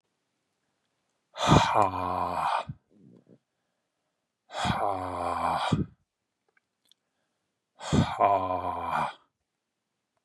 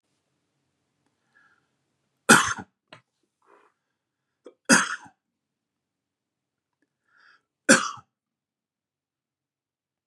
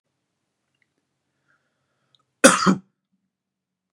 {
  "exhalation_length": "10.2 s",
  "exhalation_amplitude": 16911,
  "exhalation_signal_mean_std_ratio": 0.45,
  "three_cough_length": "10.1 s",
  "three_cough_amplitude": 30683,
  "three_cough_signal_mean_std_ratio": 0.18,
  "cough_length": "3.9 s",
  "cough_amplitude": 32768,
  "cough_signal_mean_std_ratio": 0.19,
  "survey_phase": "beta (2021-08-13 to 2022-03-07)",
  "age": "18-44",
  "gender": "Male",
  "wearing_mask": "No",
  "symptom_none": true,
  "smoker_status": "Never smoked",
  "respiratory_condition_asthma": false,
  "respiratory_condition_other": false,
  "recruitment_source": "REACT",
  "submission_delay": "1 day",
  "covid_test_result": "Negative",
  "covid_test_method": "RT-qPCR",
  "influenza_a_test_result": "Negative",
  "influenza_b_test_result": "Negative"
}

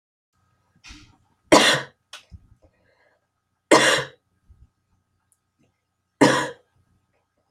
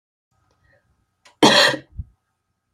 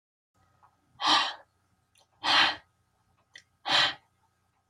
{
  "three_cough_length": "7.5 s",
  "three_cough_amplitude": 30359,
  "three_cough_signal_mean_std_ratio": 0.26,
  "cough_length": "2.7 s",
  "cough_amplitude": 30230,
  "cough_signal_mean_std_ratio": 0.28,
  "exhalation_length": "4.7 s",
  "exhalation_amplitude": 12368,
  "exhalation_signal_mean_std_ratio": 0.35,
  "survey_phase": "alpha (2021-03-01 to 2021-08-12)",
  "age": "18-44",
  "gender": "Female",
  "wearing_mask": "No",
  "symptom_cough_any": true,
  "symptom_new_continuous_cough": true,
  "symptom_abdominal_pain": true,
  "symptom_headache": true,
  "smoker_status": "Never smoked",
  "respiratory_condition_asthma": false,
  "respiratory_condition_other": true,
  "recruitment_source": "Test and Trace",
  "submission_delay": "1 day",
  "covid_test_result": "Positive",
  "covid_test_method": "RT-qPCR"
}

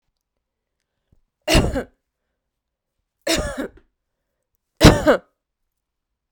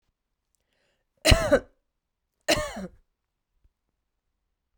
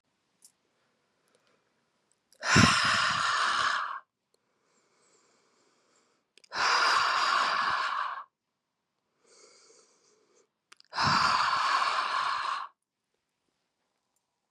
{
  "three_cough_length": "6.3 s",
  "three_cough_amplitude": 32768,
  "three_cough_signal_mean_std_ratio": 0.26,
  "cough_length": "4.8 s",
  "cough_amplitude": 25326,
  "cough_signal_mean_std_ratio": 0.24,
  "exhalation_length": "14.5 s",
  "exhalation_amplitude": 13512,
  "exhalation_signal_mean_std_ratio": 0.48,
  "survey_phase": "beta (2021-08-13 to 2022-03-07)",
  "age": "45-64",
  "gender": "Female",
  "wearing_mask": "No",
  "symptom_cough_any": true,
  "symptom_runny_or_blocked_nose": true,
  "symptom_sore_throat": true,
  "symptom_fatigue": true,
  "symptom_fever_high_temperature": true,
  "symptom_change_to_sense_of_smell_or_taste": true,
  "symptom_loss_of_taste": true,
  "symptom_onset": "7 days",
  "smoker_status": "Ex-smoker",
  "respiratory_condition_asthma": false,
  "respiratory_condition_other": false,
  "recruitment_source": "Test and Trace",
  "submission_delay": "2 days",
  "covid_test_result": "Positive",
  "covid_test_method": "RT-qPCR"
}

